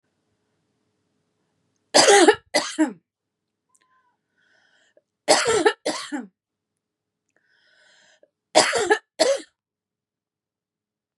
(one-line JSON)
{"three_cough_length": "11.2 s", "three_cough_amplitude": 29506, "three_cough_signal_mean_std_ratio": 0.3, "survey_phase": "beta (2021-08-13 to 2022-03-07)", "age": "18-44", "gender": "Female", "wearing_mask": "No", "symptom_sore_throat": true, "smoker_status": "Never smoked", "respiratory_condition_asthma": false, "respiratory_condition_other": false, "recruitment_source": "Test and Trace", "submission_delay": "2 days", "covid_test_result": "Positive", "covid_test_method": "RT-qPCR", "covid_ct_value": 26.1, "covid_ct_gene": "N gene"}